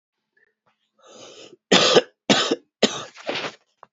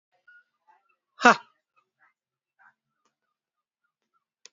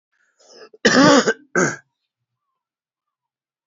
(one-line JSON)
{"three_cough_length": "3.9 s", "three_cough_amplitude": 29335, "three_cough_signal_mean_std_ratio": 0.35, "exhalation_length": "4.5 s", "exhalation_amplitude": 29650, "exhalation_signal_mean_std_ratio": 0.11, "cough_length": "3.7 s", "cough_amplitude": 29283, "cough_signal_mean_std_ratio": 0.33, "survey_phase": "alpha (2021-03-01 to 2021-08-12)", "age": "45-64", "gender": "Male", "wearing_mask": "No", "symptom_shortness_of_breath": true, "symptom_fatigue": true, "symptom_headache": true, "smoker_status": "Never smoked", "respiratory_condition_asthma": true, "respiratory_condition_other": false, "recruitment_source": "Test and Trace", "submission_delay": "2 days", "covid_test_result": "Positive", "covid_test_method": "RT-qPCR", "covid_ct_value": 28.7, "covid_ct_gene": "N gene"}